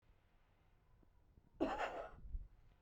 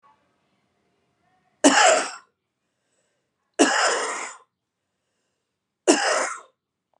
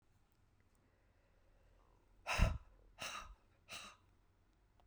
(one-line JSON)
{"cough_length": "2.8 s", "cough_amplitude": 1670, "cough_signal_mean_std_ratio": 0.44, "three_cough_length": "7.0 s", "three_cough_amplitude": 28239, "three_cough_signal_mean_std_ratio": 0.35, "exhalation_length": "4.9 s", "exhalation_amplitude": 3131, "exhalation_signal_mean_std_ratio": 0.27, "survey_phase": "beta (2021-08-13 to 2022-03-07)", "age": "45-64", "gender": "Female", "wearing_mask": "No", "symptom_cough_any": true, "symptom_runny_or_blocked_nose": true, "symptom_fatigue": true, "symptom_headache": true, "smoker_status": "Ex-smoker", "respiratory_condition_asthma": true, "respiratory_condition_other": false, "recruitment_source": "Test and Trace", "submission_delay": "2 days", "covid_test_result": "Positive", "covid_test_method": "LFT"}